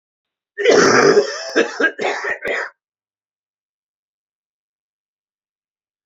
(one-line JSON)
{"cough_length": "6.1 s", "cough_amplitude": 32767, "cough_signal_mean_std_ratio": 0.4, "survey_phase": "beta (2021-08-13 to 2022-03-07)", "age": "45-64", "gender": "Male", "wearing_mask": "No", "symptom_cough_any": true, "symptom_fatigue": true, "symptom_onset": "5 days", "smoker_status": "Never smoked", "respiratory_condition_asthma": true, "respiratory_condition_other": false, "recruitment_source": "Test and Trace", "submission_delay": "2 days", "covid_test_result": "Positive", "covid_test_method": "RT-qPCR", "covid_ct_value": 22.8, "covid_ct_gene": "S gene", "covid_ct_mean": 23.2, "covid_viral_load": "24000 copies/ml", "covid_viral_load_category": "Low viral load (10K-1M copies/ml)"}